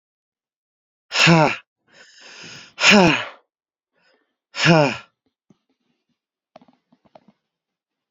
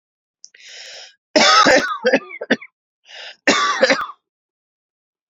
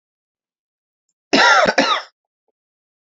{"exhalation_length": "8.1 s", "exhalation_amplitude": 31323, "exhalation_signal_mean_std_ratio": 0.29, "three_cough_length": "5.3 s", "three_cough_amplitude": 32434, "three_cough_signal_mean_std_ratio": 0.42, "cough_length": "3.1 s", "cough_amplitude": 29234, "cough_signal_mean_std_ratio": 0.36, "survey_phase": "beta (2021-08-13 to 2022-03-07)", "age": "18-44", "gender": "Male", "wearing_mask": "No", "symptom_none": true, "smoker_status": "Never smoked", "respiratory_condition_asthma": false, "respiratory_condition_other": false, "recruitment_source": "REACT", "submission_delay": "1 day", "covid_test_result": "Negative", "covid_test_method": "RT-qPCR", "influenza_a_test_result": "Negative", "influenza_b_test_result": "Negative"}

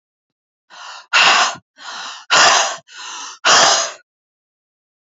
{"exhalation_length": "5.0 s", "exhalation_amplitude": 32768, "exhalation_signal_mean_std_ratio": 0.46, "survey_phase": "beta (2021-08-13 to 2022-03-07)", "age": "18-44", "gender": "Female", "wearing_mask": "No", "symptom_cough_any": true, "symptom_runny_or_blocked_nose": true, "symptom_sore_throat": true, "symptom_fatigue": true, "symptom_change_to_sense_of_smell_or_taste": true, "symptom_onset": "4 days", "smoker_status": "Never smoked", "respiratory_condition_asthma": false, "respiratory_condition_other": false, "recruitment_source": "Test and Trace", "submission_delay": "2 days", "covid_test_result": "Positive", "covid_test_method": "RT-qPCR", "covid_ct_value": 22.2, "covid_ct_gene": "ORF1ab gene", "covid_ct_mean": 23.1, "covid_viral_load": "26000 copies/ml", "covid_viral_load_category": "Low viral load (10K-1M copies/ml)"}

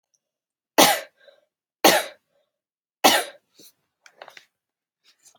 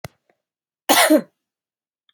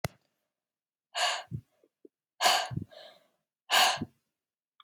{"three_cough_length": "5.4 s", "three_cough_amplitude": 30564, "three_cough_signal_mean_std_ratio": 0.25, "cough_length": "2.1 s", "cough_amplitude": 28639, "cough_signal_mean_std_ratio": 0.31, "exhalation_length": "4.8 s", "exhalation_amplitude": 11369, "exhalation_signal_mean_std_ratio": 0.35, "survey_phase": "beta (2021-08-13 to 2022-03-07)", "age": "18-44", "gender": "Female", "wearing_mask": "No", "symptom_none": true, "smoker_status": "Never smoked", "respiratory_condition_asthma": false, "respiratory_condition_other": false, "recruitment_source": "REACT", "submission_delay": "2 days", "covid_test_result": "Negative", "covid_test_method": "RT-qPCR", "influenza_a_test_result": "Negative", "influenza_b_test_result": "Negative"}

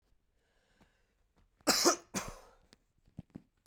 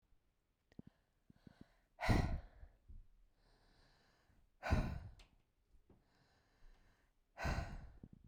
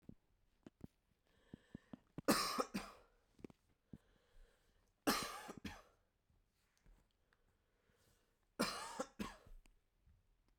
{"cough_length": "3.7 s", "cough_amplitude": 8945, "cough_signal_mean_std_ratio": 0.26, "exhalation_length": "8.3 s", "exhalation_amplitude": 3131, "exhalation_signal_mean_std_ratio": 0.32, "three_cough_length": "10.6 s", "three_cough_amplitude": 3145, "three_cough_signal_mean_std_ratio": 0.29, "survey_phase": "beta (2021-08-13 to 2022-03-07)", "age": "18-44", "gender": "Male", "wearing_mask": "No", "symptom_none": true, "smoker_status": "Never smoked", "respiratory_condition_asthma": false, "respiratory_condition_other": false, "recruitment_source": "REACT", "submission_delay": "1 day", "covid_test_result": "Negative", "covid_test_method": "RT-qPCR"}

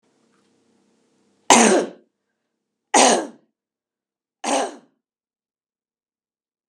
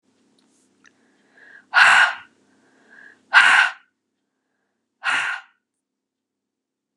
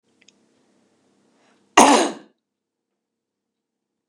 {"three_cough_length": "6.7 s", "three_cough_amplitude": 32768, "three_cough_signal_mean_std_ratio": 0.27, "exhalation_length": "7.0 s", "exhalation_amplitude": 30543, "exhalation_signal_mean_std_ratio": 0.3, "cough_length": "4.1 s", "cough_amplitude": 32768, "cough_signal_mean_std_ratio": 0.21, "survey_phase": "beta (2021-08-13 to 2022-03-07)", "age": "45-64", "gender": "Female", "wearing_mask": "No", "symptom_none": true, "smoker_status": "Never smoked", "respiratory_condition_asthma": false, "respiratory_condition_other": false, "recruitment_source": "REACT", "submission_delay": "2 days", "covid_test_result": "Negative", "covid_test_method": "RT-qPCR", "influenza_a_test_result": "Negative", "influenza_b_test_result": "Negative"}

